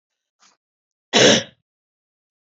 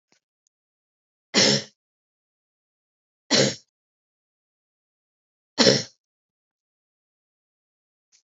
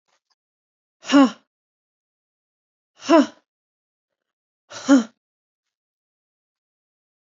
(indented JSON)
{
  "cough_length": "2.5 s",
  "cough_amplitude": 27574,
  "cough_signal_mean_std_ratio": 0.27,
  "three_cough_length": "8.3 s",
  "three_cough_amplitude": 27306,
  "three_cough_signal_mean_std_ratio": 0.22,
  "exhalation_length": "7.3 s",
  "exhalation_amplitude": 26360,
  "exhalation_signal_mean_std_ratio": 0.21,
  "survey_phase": "beta (2021-08-13 to 2022-03-07)",
  "age": "18-44",
  "gender": "Female",
  "wearing_mask": "No",
  "symptom_fatigue": true,
  "symptom_change_to_sense_of_smell_or_taste": true,
  "symptom_loss_of_taste": true,
  "symptom_other": true,
  "symptom_onset": "4 days",
  "smoker_status": "Never smoked",
  "respiratory_condition_asthma": false,
  "respiratory_condition_other": false,
  "recruitment_source": "Test and Trace",
  "submission_delay": "2 days",
  "covid_test_result": "Positive",
  "covid_test_method": "RT-qPCR",
  "covid_ct_value": 12.5,
  "covid_ct_gene": "ORF1ab gene"
}